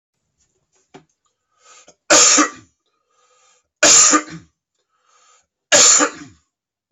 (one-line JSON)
{"three_cough_length": "6.9 s", "three_cough_amplitude": 32768, "three_cough_signal_mean_std_ratio": 0.34, "survey_phase": "beta (2021-08-13 to 2022-03-07)", "age": "18-44", "gender": "Female", "wearing_mask": "No", "symptom_cough_any": true, "symptom_runny_or_blocked_nose": true, "symptom_fatigue": true, "symptom_headache": true, "symptom_change_to_sense_of_smell_or_taste": true, "symptom_loss_of_taste": true, "symptom_onset": "4 days", "smoker_status": "Ex-smoker", "respiratory_condition_asthma": false, "respiratory_condition_other": false, "recruitment_source": "Test and Trace", "submission_delay": "3 days", "covid_test_result": "Positive", "covid_test_method": "RT-qPCR"}